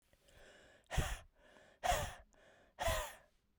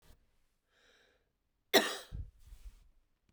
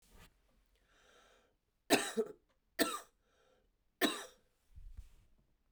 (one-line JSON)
{"exhalation_length": "3.6 s", "exhalation_amplitude": 2428, "exhalation_signal_mean_std_ratio": 0.41, "cough_length": "3.3 s", "cough_amplitude": 10040, "cough_signal_mean_std_ratio": 0.23, "three_cough_length": "5.7 s", "three_cough_amplitude": 6280, "three_cough_signal_mean_std_ratio": 0.28, "survey_phase": "beta (2021-08-13 to 2022-03-07)", "age": "45-64", "gender": "Female", "wearing_mask": "No", "symptom_runny_or_blocked_nose": true, "symptom_sore_throat": true, "symptom_other": true, "symptom_onset": "3 days", "smoker_status": "Never smoked", "respiratory_condition_asthma": true, "respiratory_condition_other": false, "recruitment_source": "Test and Trace", "submission_delay": "2 days", "covid_test_result": "Positive", "covid_test_method": "RT-qPCR", "covid_ct_value": 18.3, "covid_ct_gene": "N gene"}